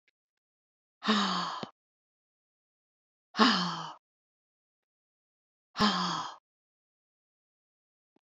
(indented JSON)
{
  "exhalation_length": "8.4 s",
  "exhalation_amplitude": 14260,
  "exhalation_signal_mean_std_ratio": 0.31,
  "survey_phase": "alpha (2021-03-01 to 2021-08-12)",
  "age": "65+",
  "gender": "Female",
  "wearing_mask": "No",
  "symptom_none": true,
  "smoker_status": "Never smoked",
  "respiratory_condition_asthma": false,
  "respiratory_condition_other": false,
  "recruitment_source": "REACT",
  "submission_delay": "3 days",
  "covid_test_result": "Negative",
  "covid_test_method": "RT-qPCR"
}